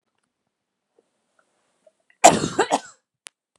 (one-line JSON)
{"cough_length": "3.6 s", "cough_amplitude": 32768, "cough_signal_mean_std_ratio": 0.22, "survey_phase": "beta (2021-08-13 to 2022-03-07)", "age": "18-44", "gender": "Female", "wearing_mask": "No", "symptom_cough_any": true, "symptom_abdominal_pain": true, "symptom_onset": "12 days", "smoker_status": "Ex-smoker", "respiratory_condition_asthma": false, "respiratory_condition_other": false, "recruitment_source": "REACT", "submission_delay": "3 days", "covid_test_result": "Negative", "covid_test_method": "RT-qPCR", "influenza_a_test_result": "Unknown/Void", "influenza_b_test_result": "Unknown/Void"}